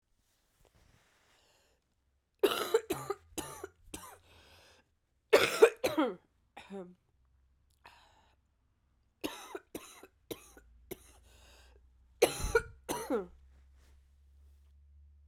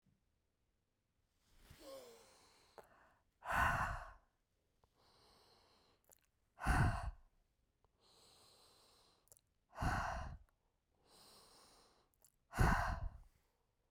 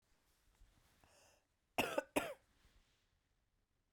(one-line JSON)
{"three_cough_length": "15.3 s", "three_cough_amplitude": 13454, "three_cough_signal_mean_std_ratio": 0.26, "exhalation_length": "13.9 s", "exhalation_amplitude": 2929, "exhalation_signal_mean_std_ratio": 0.32, "cough_length": "3.9 s", "cough_amplitude": 2796, "cough_signal_mean_std_ratio": 0.24, "survey_phase": "beta (2021-08-13 to 2022-03-07)", "age": "45-64", "gender": "Female", "wearing_mask": "No", "symptom_cough_any": true, "symptom_headache": true, "symptom_other": true, "smoker_status": "Never smoked", "respiratory_condition_asthma": false, "respiratory_condition_other": false, "recruitment_source": "Test and Trace", "submission_delay": "1 day", "covid_test_result": "Positive", "covid_test_method": "RT-qPCR", "covid_ct_value": 18.5, "covid_ct_gene": "ORF1ab gene", "covid_ct_mean": 18.6, "covid_viral_load": "780000 copies/ml", "covid_viral_load_category": "Low viral load (10K-1M copies/ml)"}